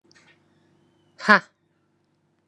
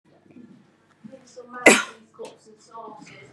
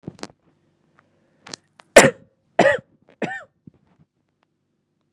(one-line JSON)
{"exhalation_length": "2.5 s", "exhalation_amplitude": 32761, "exhalation_signal_mean_std_ratio": 0.16, "cough_length": "3.3 s", "cough_amplitude": 32767, "cough_signal_mean_std_ratio": 0.23, "three_cough_length": "5.1 s", "three_cough_amplitude": 32768, "three_cough_signal_mean_std_ratio": 0.2, "survey_phase": "beta (2021-08-13 to 2022-03-07)", "age": "18-44", "gender": "Female", "wearing_mask": "Yes", "symptom_none": true, "smoker_status": "Current smoker (1 to 10 cigarettes per day)", "respiratory_condition_asthma": false, "respiratory_condition_other": false, "recruitment_source": "REACT", "submission_delay": "2 days", "covid_test_result": "Negative", "covid_test_method": "RT-qPCR"}